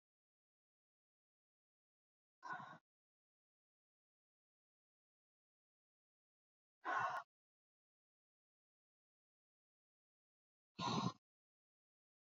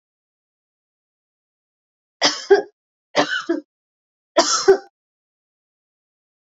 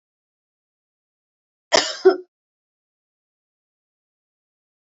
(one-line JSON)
{"exhalation_length": "12.4 s", "exhalation_amplitude": 1334, "exhalation_signal_mean_std_ratio": 0.21, "three_cough_length": "6.5 s", "three_cough_amplitude": 29792, "three_cough_signal_mean_std_ratio": 0.27, "cough_length": "4.9 s", "cough_amplitude": 30141, "cough_signal_mean_std_ratio": 0.17, "survey_phase": "alpha (2021-03-01 to 2021-08-12)", "age": "18-44", "gender": "Female", "wearing_mask": "No", "symptom_none": true, "smoker_status": "Never smoked", "respiratory_condition_asthma": false, "respiratory_condition_other": false, "recruitment_source": "REACT", "submission_delay": "3 days", "covid_test_result": "Negative", "covid_test_method": "RT-qPCR"}